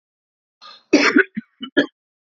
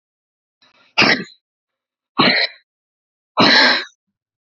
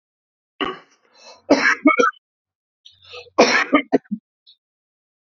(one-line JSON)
{"cough_length": "2.4 s", "cough_amplitude": 28057, "cough_signal_mean_std_ratio": 0.32, "exhalation_length": "4.5 s", "exhalation_amplitude": 32632, "exhalation_signal_mean_std_ratio": 0.38, "three_cough_length": "5.2 s", "three_cough_amplitude": 28712, "three_cough_signal_mean_std_ratio": 0.35, "survey_phase": "alpha (2021-03-01 to 2021-08-12)", "age": "18-44", "gender": "Male", "wearing_mask": "No", "symptom_diarrhoea": true, "symptom_fatigue": true, "symptom_headache": true, "smoker_status": "Never smoked", "respiratory_condition_asthma": false, "respiratory_condition_other": false, "recruitment_source": "REACT", "submission_delay": "1 day", "covid_test_result": "Negative", "covid_test_method": "RT-qPCR"}